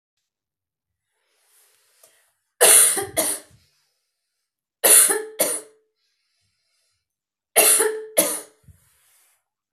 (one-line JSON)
{"three_cough_length": "9.7 s", "three_cough_amplitude": 32768, "three_cough_signal_mean_std_ratio": 0.32, "survey_phase": "beta (2021-08-13 to 2022-03-07)", "age": "45-64", "gender": "Female", "wearing_mask": "No", "symptom_runny_or_blocked_nose": true, "symptom_sore_throat": true, "symptom_diarrhoea": true, "symptom_fatigue": true, "symptom_headache": true, "symptom_onset": "3 days", "smoker_status": "Never smoked", "respiratory_condition_asthma": false, "respiratory_condition_other": false, "recruitment_source": "Test and Trace", "submission_delay": "2 days", "covid_test_result": "Positive", "covid_test_method": "RT-qPCR", "covid_ct_value": 18.8, "covid_ct_gene": "ORF1ab gene", "covid_ct_mean": 19.2, "covid_viral_load": "510000 copies/ml", "covid_viral_load_category": "Low viral load (10K-1M copies/ml)"}